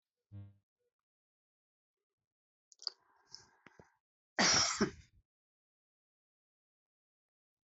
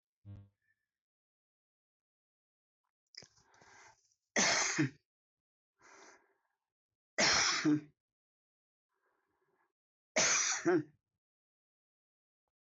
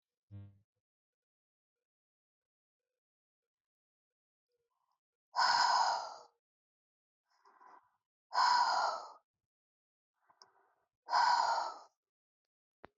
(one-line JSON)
{"cough_length": "7.7 s", "cough_amplitude": 3511, "cough_signal_mean_std_ratio": 0.22, "three_cough_length": "12.8 s", "three_cough_amplitude": 3749, "three_cough_signal_mean_std_ratio": 0.31, "exhalation_length": "13.0 s", "exhalation_amplitude": 3994, "exhalation_signal_mean_std_ratio": 0.33, "survey_phase": "alpha (2021-03-01 to 2021-08-12)", "age": "65+", "gender": "Female", "wearing_mask": "No", "symptom_none": true, "smoker_status": "Never smoked", "respiratory_condition_asthma": false, "respiratory_condition_other": false, "recruitment_source": "REACT", "submission_delay": "8 days", "covid_test_result": "Negative", "covid_test_method": "RT-qPCR"}